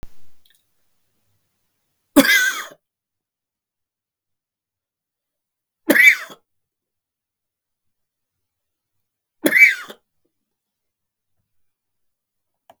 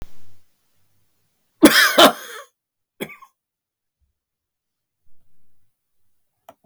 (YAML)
three_cough_length: 12.8 s
three_cough_amplitude: 32766
three_cough_signal_mean_std_ratio: 0.22
cough_length: 6.7 s
cough_amplitude: 32768
cough_signal_mean_std_ratio: 0.25
survey_phase: beta (2021-08-13 to 2022-03-07)
age: 65+
gender: Male
wearing_mask: 'No'
symptom_fatigue: true
smoker_status: Ex-smoker
respiratory_condition_asthma: false
respiratory_condition_other: false
recruitment_source: REACT
submission_delay: 0 days
covid_test_result: Negative
covid_test_method: RT-qPCR
influenza_a_test_result: Negative
influenza_b_test_result: Negative